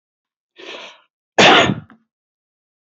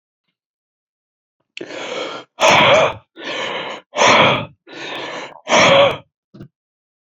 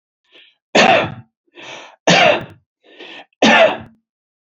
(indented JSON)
{
  "cough_length": "3.0 s",
  "cough_amplitude": 28841,
  "cough_signal_mean_std_ratio": 0.3,
  "exhalation_length": "7.1 s",
  "exhalation_amplitude": 30797,
  "exhalation_signal_mean_std_ratio": 0.46,
  "three_cough_length": "4.4 s",
  "three_cough_amplitude": 29962,
  "three_cough_signal_mean_std_ratio": 0.42,
  "survey_phase": "beta (2021-08-13 to 2022-03-07)",
  "age": "45-64",
  "gender": "Male",
  "wearing_mask": "No",
  "symptom_none": true,
  "smoker_status": "Current smoker (1 to 10 cigarettes per day)",
  "respiratory_condition_asthma": false,
  "respiratory_condition_other": false,
  "recruitment_source": "REACT",
  "submission_delay": "1 day",
  "covid_test_result": "Negative",
  "covid_test_method": "RT-qPCR"
}